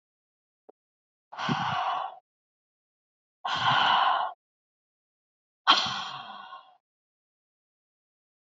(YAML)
exhalation_length: 8.5 s
exhalation_amplitude: 16873
exhalation_signal_mean_std_ratio: 0.38
survey_phase: beta (2021-08-13 to 2022-03-07)
age: 18-44
gender: Female
wearing_mask: 'No'
symptom_none: true
symptom_onset: 11 days
smoker_status: Never smoked
respiratory_condition_asthma: false
respiratory_condition_other: false
recruitment_source: REACT
submission_delay: 2 days
covid_test_result: Negative
covid_test_method: RT-qPCR
influenza_a_test_result: Negative
influenza_b_test_result: Negative